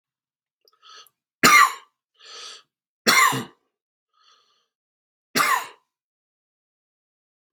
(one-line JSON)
{"three_cough_length": "7.5 s", "three_cough_amplitude": 32691, "three_cough_signal_mean_std_ratio": 0.27, "survey_phase": "beta (2021-08-13 to 2022-03-07)", "age": "45-64", "gender": "Male", "wearing_mask": "No", "symptom_cough_any": true, "symptom_runny_or_blocked_nose": true, "symptom_fatigue": true, "symptom_onset": "6 days", "smoker_status": "Never smoked", "respiratory_condition_asthma": false, "respiratory_condition_other": false, "recruitment_source": "Test and Trace", "submission_delay": "1 day", "covid_test_result": "Positive", "covid_test_method": "RT-qPCR", "covid_ct_value": 18.3, "covid_ct_gene": "ORF1ab gene", "covid_ct_mean": 18.8, "covid_viral_load": "690000 copies/ml", "covid_viral_load_category": "Low viral load (10K-1M copies/ml)"}